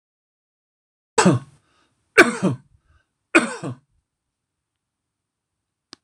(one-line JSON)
{"three_cough_length": "6.0 s", "three_cough_amplitude": 26028, "three_cough_signal_mean_std_ratio": 0.24, "survey_phase": "alpha (2021-03-01 to 2021-08-12)", "age": "45-64", "gender": "Male", "wearing_mask": "No", "symptom_none": true, "smoker_status": "Never smoked", "respiratory_condition_asthma": false, "respiratory_condition_other": false, "recruitment_source": "REACT", "submission_delay": "1 day", "covid_test_result": "Negative", "covid_test_method": "RT-qPCR"}